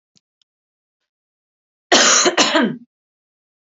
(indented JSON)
{
  "cough_length": "3.7 s",
  "cough_amplitude": 31433,
  "cough_signal_mean_std_ratio": 0.37,
  "survey_phase": "beta (2021-08-13 to 2022-03-07)",
  "age": "18-44",
  "gender": "Female",
  "wearing_mask": "No",
  "symptom_none": true,
  "smoker_status": "Never smoked",
  "respiratory_condition_asthma": false,
  "respiratory_condition_other": false,
  "recruitment_source": "REACT",
  "submission_delay": "2 days",
  "covid_test_result": "Negative",
  "covid_test_method": "RT-qPCR"
}